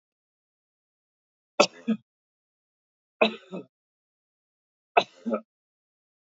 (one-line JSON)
{"three_cough_length": "6.3 s", "three_cough_amplitude": 21279, "three_cough_signal_mean_std_ratio": 0.19, "survey_phase": "alpha (2021-03-01 to 2021-08-12)", "age": "45-64", "gender": "Male", "wearing_mask": "No", "symptom_none": true, "smoker_status": "Never smoked", "respiratory_condition_asthma": false, "respiratory_condition_other": false, "recruitment_source": "REACT", "submission_delay": "6 days", "covid_test_result": "Negative", "covid_test_method": "RT-qPCR"}